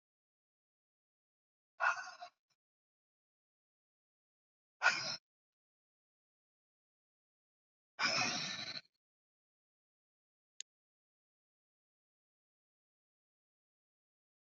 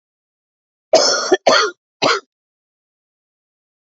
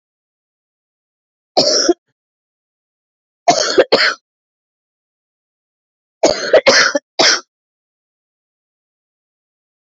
{"exhalation_length": "14.5 s", "exhalation_amplitude": 4792, "exhalation_signal_mean_std_ratio": 0.21, "cough_length": "3.8 s", "cough_amplitude": 28950, "cough_signal_mean_std_ratio": 0.36, "three_cough_length": "10.0 s", "three_cough_amplitude": 31565, "three_cough_signal_mean_std_ratio": 0.32, "survey_phase": "alpha (2021-03-01 to 2021-08-12)", "age": "45-64", "gender": "Female", "wearing_mask": "No", "symptom_cough_any": true, "symptom_shortness_of_breath": true, "symptom_fatigue": true, "symptom_headache": true, "symptom_change_to_sense_of_smell_or_taste": true, "symptom_onset": "4 days", "smoker_status": "Ex-smoker", "respiratory_condition_asthma": false, "respiratory_condition_other": false, "recruitment_source": "Test and Trace", "submission_delay": "2 days", "covid_test_result": "Positive", "covid_test_method": "RT-qPCR", "covid_ct_value": 12.5, "covid_ct_gene": "ORF1ab gene", "covid_ct_mean": 13.3, "covid_viral_load": "45000000 copies/ml", "covid_viral_load_category": "High viral load (>1M copies/ml)"}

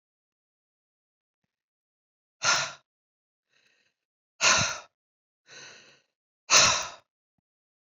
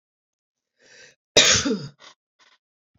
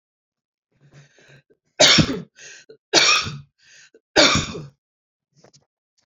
{"exhalation_length": "7.9 s", "exhalation_amplitude": 17504, "exhalation_signal_mean_std_ratio": 0.26, "cough_length": "3.0 s", "cough_amplitude": 27389, "cough_signal_mean_std_ratio": 0.29, "three_cough_length": "6.1 s", "three_cough_amplitude": 31459, "three_cough_signal_mean_std_ratio": 0.33, "survey_phase": "beta (2021-08-13 to 2022-03-07)", "age": "65+", "gender": "Female", "wearing_mask": "No", "symptom_none": true, "smoker_status": "Never smoked", "respiratory_condition_asthma": false, "respiratory_condition_other": false, "recruitment_source": "REACT", "submission_delay": "1 day", "covid_test_result": "Negative", "covid_test_method": "RT-qPCR"}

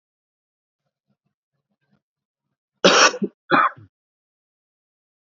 {"cough_length": "5.4 s", "cough_amplitude": 30896, "cough_signal_mean_std_ratio": 0.24, "survey_phase": "beta (2021-08-13 to 2022-03-07)", "age": "18-44", "gender": "Male", "wearing_mask": "No", "symptom_cough_any": true, "symptom_runny_or_blocked_nose": true, "symptom_shortness_of_breath": true, "symptom_change_to_sense_of_smell_or_taste": true, "symptom_other": true, "smoker_status": "Never smoked", "respiratory_condition_asthma": false, "respiratory_condition_other": false, "recruitment_source": "Test and Trace", "submission_delay": "1 day", "covid_test_result": "Positive", "covid_test_method": "RT-qPCR", "covid_ct_value": 22.6, "covid_ct_gene": "ORF1ab gene", "covid_ct_mean": 22.8, "covid_viral_load": "33000 copies/ml", "covid_viral_load_category": "Low viral load (10K-1M copies/ml)"}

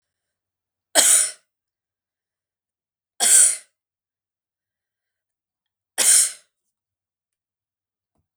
{"three_cough_length": "8.4 s", "three_cough_amplitude": 32768, "three_cough_signal_mean_std_ratio": 0.27, "survey_phase": "beta (2021-08-13 to 2022-03-07)", "age": "45-64", "gender": "Female", "wearing_mask": "No", "symptom_none": true, "symptom_onset": "7 days", "smoker_status": "Never smoked", "respiratory_condition_asthma": false, "respiratory_condition_other": false, "recruitment_source": "REACT", "submission_delay": "1 day", "covid_test_result": "Negative", "covid_test_method": "RT-qPCR", "influenza_a_test_result": "Negative", "influenza_b_test_result": "Negative"}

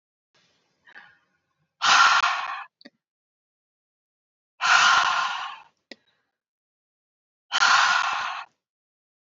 {"exhalation_length": "9.2 s", "exhalation_amplitude": 18906, "exhalation_signal_mean_std_ratio": 0.4, "survey_phase": "beta (2021-08-13 to 2022-03-07)", "age": "45-64", "gender": "Female", "wearing_mask": "No", "symptom_none": true, "smoker_status": "Ex-smoker", "respiratory_condition_asthma": false, "respiratory_condition_other": false, "recruitment_source": "REACT", "submission_delay": "1 day", "covid_test_result": "Negative", "covid_test_method": "RT-qPCR", "influenza_a_test_result": "Negative", "influenza_b_test_result": "Negative"}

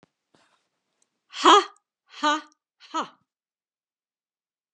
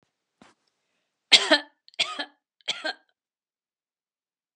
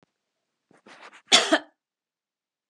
{"exhalation_length": "4.7 s", "exhalation_amplitude": 27215, "exhalation_signal_mean_std_ratio": 0.23, "three_cough_length": "4.6 s", "three_cough_amplitude": 32083, "three_cough_signal_mean_std_ratio": 0.21, "cough_length": "2.7 s", "cough_amplitude": 27142, "cough_signal_mean_std_ratio": 0.22, "survey_phase": "beta (2021-08-13 to 2022-03-07)", "age": "65+", "gender": "Female", "wearing_mask": "No", "symptom_none": true, "smoker_status": "Never smoked", "respiratory_condition_asthma": false, "respiratory_condition_other": false, "recruitment_source": "REACT", "submission_delay": "1 day", "covid_test_result": "Negative", "covid_test_method": "RT-qPCR"}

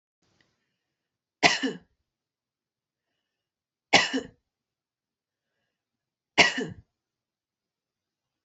{"three_cough_length": "8.4 s", "three_cough_amplitude": 25162, "three_cough_signal_mean_std_ratio": 0.2, "survey_phase": "beta (2021-08-13 to 2022-03-07)", "age": "18-44", "gender": "Female", "wearing_mask": "No", "symptom_runny_or_blocked_nose": true, "symptom_headache": true, "smoker_status": "Never smoked", "respiratory_condition_asthma": false, "respiratory_condition_other": false, "recruitment_source": "Test and Trace", "submission_delay": "0 days", "covid_test_result": "Negative", "covid_test_method": "RT-qPCR"}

